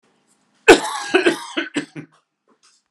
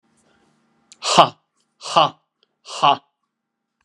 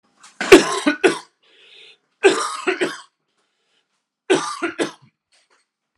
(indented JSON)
{
  "cough_length": "2.9 s",
  "cough_amplitude": 32768,
  "cough_signal_mean_std_ratio": 0.32,
  "exhalation_length": "3.8 s",
  "exhalation_amplitude": 32768,
  "exhalation_signal_mean_std_ratio": 0.28,
  "three_cough_length": "6.0 s",
  "three_cough_amplitude": 32768,
  "three_cough_signal_mean_std_ratio": 0.33,
  "survey_phase": "alpha (2021-03-01 to 2021-08-12)",
  "age": "65+",
  "gender": "Male",
  "wearing_mask": "No",
  "symptom_cough_any": true,
  "symptom_change_to_sense_of_smell_or_taste": true,
  "symptom_loss_of_taste": true,
  "symptom_onset": "6 days",
  "smoker_status": "Never smoked",
  "respiratory_condition_asthma": false,
  "respiratory_condition_other": false,
  "recruitment_source": "Test and Trace",
  "submission_delay": "1 day",
  "covid_test_result": "Positive",
  "covid_test_method": "RT-qPCR",
  "covid_ct_value": 15.4,
  "covid_ct_gene": "ORF1ab gene",
  "covid_ct_mean": 15.8,
  "covid_viral_load": "6700000 copies/ml",
  "covid_viral_load_category": "High viral load (>1M copies/ml)"
}